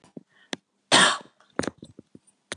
cough_length: 2.6 s
cough_amplitude: 24885
cough_signal_mean_std_ratio: 0.28
survey_phase: beta (2021-08-13 to 2022-03-07)
age: 65+
gender: Female
wearing_mask: 'No'
symptom_none: true
smoker_status: Never smoked
respiratory_condition_asthma: false
respiratory_condition_other: false
recruitment_source: REACT
submission_delay: 1 day
covid_test_result: Negative
covid_test_method: RT-qPCR
influenza_a_test_result: Negative
influenza_b_test_result: Negative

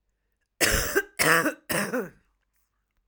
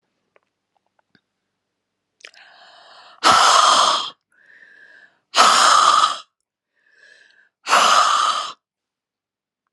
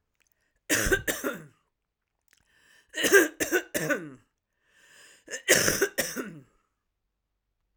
cough_length: 3.1 s
cough_amplitude: 16940
cough_signal_mean_std_ratio: 0.46
exhalation_length: 9.7 s
exhalation_amplitude: 32671
exhalation_signal_mean_std_ratio: 0.42
three_cough_length: 7.8 s
three_cough_amplitude: 20396
three_cough_signal_mean_std_ratio: 0.37
survey_phase: alpha (2021-03-01 to 2021-08-12)
age: 65+
gender: Female
wearing_mask: 'No'
symptom_none: true
smoker_status: Ex-smoker
respiratory_condition_asthma: false
respiratory_condition_other: false
recruitment_source: REACT
submission_delay: 1 day
covid_test_result: Negative
covid_test_method: RT-qPCR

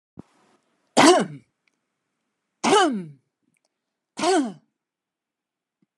three_cough_length: 6.0 s
three_cough_amplitude: 27787
three_cough_signal_mean_std_ratio: 0.32
survey_phase: alpha (2021-03-01 to 2021-08-12)
age: 65+
gender: Female
wearing_mask: 'No'
symptom_none: true
smoker_status: Never smoked
respiratory_condition_asthma: false
respiratory_condition_other: false
recruitment_source: REACT
submission_delay: 1 day
covid_test_result: Negative
covid_test_method: RT-qPCR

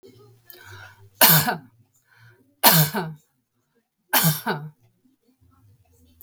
three_cough_length: 6.2 s
three_cough_amplitude: 32768
three_cough_signal_mean_std_ratio: 0.33
survey_phase: beta (2021-08-13 to 2022-03-07)
age: 65+
gender: Female
wearing_mask: 'No'
symptom_none: true
symptom_onset: 8 days
smoker_status: Ex-smoker
respiratory_condition_asthma: false
respiratory_condition_other: false
recruitment_source: REACT
submission_delay: 1 day
covid_test_result: Negative
covid_test_method: RT-qPCR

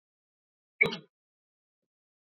cough_length: 2.3 s
cough_amplitude: 10397
cough_signal_mean_std_ratio: 0.16
survey_phase: beta (2021-08-13 to 2022-03-07)
age: 45-64
gender: Male
wearing_mask: 'No'
symptom_none: true
smoker_status: Never smoked
respiratory_condition_asthma: false
respiratory_condition_other: false
recruitment_source: REACT
submission_delay: 2 days
covid_test_result: Negative
covid_test_method: RT-qPCR
influenza_a_test_result: Unknown/Void
influenza_b_test_result: Unknown/Void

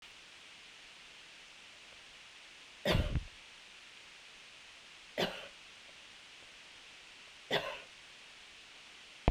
three_cough_length: 9.3 s
three_cough_amplitude: 11273
three_cough_signal_mean_std_ratio: 0.39
survey_phase: beta (2021-08-13 to 2022-03-07)
age: 45-64
gender: Female
wearing_mask: 'No'
symptom_none: true
smoker_status: Never smoked
respiratory_condition_asthma: false
respiratory_condition_other: false
recruitment_source: REACT
submission_delay: 2 days
covid_test_result: Negative
covid_test_method: RT-qPCR
influenza_a_test_result: Unknown/Void
influenza_b_test_result: Unknown/Void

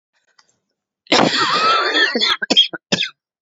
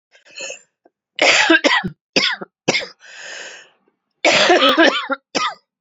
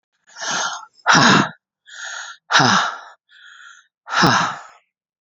cough_length: 3.4 s
cough_amplitude: 30638
cough_signal_mean_std_ratio: 0.58
three_cough_length: 5.8 s
three_cough_amplitude: 31697
three_cough_signal_mean_std_ratio: 0.5
exhalation_length: 5.2 s
exhalation_amplitude: 29797
exhalation_signal_mean_std_ratio: 0.46
survey_phase: beta (2021-08-13 to 2022-03-07)
age: 45-64
gender: Female
wearing_mask: 'No'
symptom_cough_any: true
symptom_abdominal_pain: true
symptom_fatigue: true
symptom_fever_high_temperature: true
symptom_headache: true
symptom_onset: 2 days
smoker_status: Ex-smoker
respiratory_condition_asthma: false
respiratory_condition_other: false
recruitment_source: Test and Trace
submission_delay: 2 days
covid_test_result: Positive
covid_test_method: RT-qPCR
covid_ct_value: 17.0
covid_ct_gene: ORF1ab gene
covid_ct_mean: 17.5
covid_viral_load: 1900000 copies/ml
covid_viral_load_category: High viral load (>1M copies/ml)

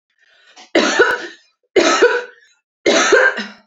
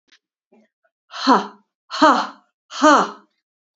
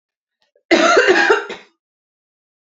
three_cough_length: 3.7 s
three_cough_amplitude: 31139
three_cough_signal_mean_std_ratio: 0.55
exhalation_length: 3.8 s
exhalation_amplitude: 28428
exhalation_signal_mean_std_ratio: 0.35
cough_length: 2.6 s
cough_amplitude: 29325
cough_signal_mean_std_ratio: 0.45
survey_phase: beta (2021-08-13 to 2022-03-07)
age: 18-44
gender: Female
wearing_mask: 'No'
symptom_none: true
smoker_status: Never smoked
respiratory_condition_asthma: true
respiratory_condition_other: false
recruitment_source: REACT
submission_delay: 1 day
covid_test_result: Negative
covid_test_method: RT-qPCR
influenza_a_test_result: Negative
influenza_b_test_result: Negative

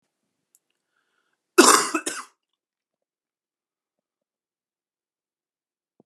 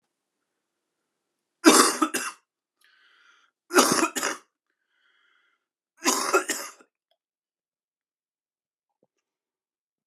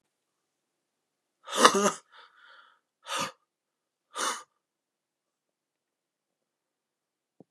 cough_length: 6.1 s
cough_amplitude: 32750
cough_signal_mean_std_ratio: 0.18
three_cough_length: 10.1 s
three_cough_amplitude: 27896
three_cough_signal_mean_std_ratio: 0.27
exhalation_length: 7.5 s
exhalation_amplitude: 28997
exhalation_signal_mean_std_ratio: 0.21
survey_phase: beta (2021-08-13 to 2022-03-07)
age: 18-44
gender: Male
wearing_mask: 'No'
symptom_new_continuous_cough: true
symptom_runny_or_blocked_nose: true
symptom_sore_throat: true
symptom_headache: true
symptom_other: true
smoker_status: Never smoked
respiratory_condition_asthma: false
respiratory_condition_other: false
recruitment_source: Test and Trace
submission_delay: 1 day
covid_test_result: Positive
covid_test_method: RT-qPCR
covid_ct_value: 15.2
covid_ct_gene: ORF1ab gene
covid_ct_mean: 15.5
covid_viral_load: 8400000 copies/ml
covid_viral_load_category: High viral load (>1M copies/ml)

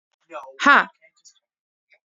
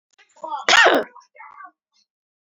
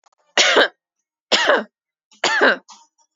exhalation_length: 2.0 s
exhalation_amplitude: 29827
exhalation_signal_mean_std_ratio: 0.24
cough_length: 2.5 s
cough_amplitude: 29601
cough_signal_mean_std_ratio: 0.34
three_cough_length: 3.2 s
three_cough_amplitude: 32767
three_cough_signal_mean_std_ratio: 0.44
survey_phase: beta (2021-08-13 to 2022-03-07)
age: 18-44
gender: Female
wearing_mask: 'No'
symptom_none: true
smoker_status: Never smoked
respiratory_condition_asthma: false
respiratory_condition_other: false
recruitment_source: REACT
submission_delay: 1 day
covid_test_result: Negative
covid_test_method: RT-qPCR
influenza_a_test_result: Negative
influenza_b_test_result: Negative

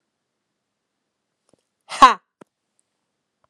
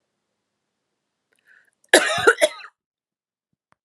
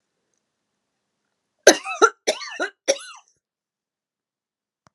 exhalation_length: 3.5 s
exhalation_amplitude: 32768
exhalation_signal_mean_std_ratio: 0.14
cough_length: 3.8 s
cough_amplitude: 32766
cough_signal_mean_std_ratio: 0.24
three_cough_length: 4.9 s
three_cough_amplitude: 32768
three_cough_signal_mean_std_ratio: 0.21
survey_phase: alpha (2021-03-01 to 2021-08-12)
age: 45-64
gender: Female
wearing_mask: 'No'
symptom_none: true
symptom_onset: 4 days
smoker_status: Ex-smoker
respiratory_condition_asthma: false
respiratory_condition_other: false
recruitment_source: REACT
submission_delay: 2 days
covid_test_result: Negative
covid_test_method: RT-qPCR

